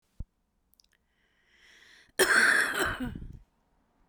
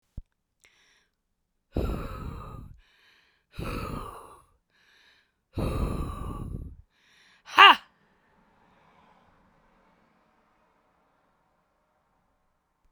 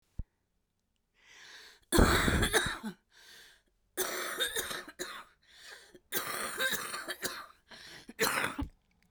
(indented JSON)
{
  "cough_length": "4.1 s",
  "cough_amplitude": 11792,
  "cough_signal_mean_std_ratio": 0.39,
  "exhalation_length": "12.9 s",
  "exhalation_amplitude": 32767,
  "exhalation_signal_mean_std_ratio": 0.22,
  "three_cough_length": "9.1 s",
  "three_cough_amplitude": 10531,
  "three_cough_signal_mean_std_ratio": 0.46,
  "survey_phase": "beta (2021-08-13 to 2022-03-07)",
  "age": "45-64",
  "gender": "Female",
  "wearing_mask": "No",
  "symptom_headache": true,
  "symptom_loss_of_taste": true,
  "symptom_onset": "12 days",
  "smoker_status": "Ex-smoker",
  "respiratory_condition_asthma": true,
  "respiratory_condition_other": true,
  "recruitment_source": "REACT",
  "submission_delay": "3 days",
  "covid_test_result": "Negative",
  "covid_test_method": "RT-qPCR"
}